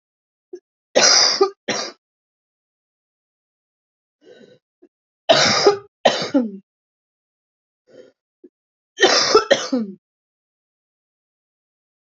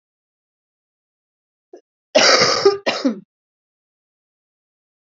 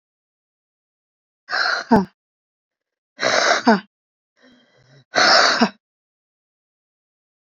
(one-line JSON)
{"three_cough_length": "12.1 s", "three_cough_amplitude": 30176, "three_cough_signal_mean_std_ratio": 0.33, "cough_length": "5.0 s", "cough_amplitude": 31338, "cough_signal_mean_std_ratio": 0.31, "exhalation_length": "7.5 s", "exhalation_amplitude": 31717, "exhalation_signal_mean_std_ratio": 0.35, "survey_phase": "beta (2021-08-13 to 2022-03-07)", "age": "18-44", "gender": "Female", "wearing_mask": "No", "symptom_cough_any": true, "symptom_new_continuous_cough": true, "symptom_runny_or_blocked_nose": true, "symptom_fatigue": true, "symptom_onset": "9 days", "smoker_status": "Never smoked", "respiratory_condition_asthma": false, "respiratory_condition_other": false, "recruitment_source": "Test and Trace", "submission_delay": "1 day", "covid_test_result": "Positive", "covid_test_method": "RT-qPCR", "covid_ct_value": 22.5, "covid_ct_gene": "N gene"}